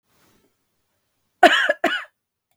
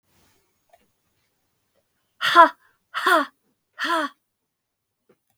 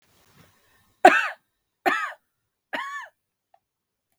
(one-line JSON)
{"cough_length": "2.6 s", "cough_amplitude": 32768, "cough_signal_mean_std_ratio": 0.29, "exhalation_length": "5.4 s", "exhalation_amplitude": 28240, "exhalation_signal_mean_std_ratio": 0.27, "three_cough_length": "4.2 s", "three_cough_amplitude": 32768, "three_cough_signal_mean_std_ratio": 0.24, "survey_phase": "beta (2021-08-13 to 2022-03-07)", "age": "45-64", "gender": "Female", "wearing_mask": "No", "symptom_none": true, "smoker_status": "Ex-smoker", "respiratory_condition_asthma": true, "respiratory_condition_other": false, "recruitment_source": "REACT", "submission_delay": "1 day", "covid_test_result": "Negative", "covid_test_method": "RT-qPCR", "influenza_a_test_result": "Negative", "influenza_b_test_result": "Negative"}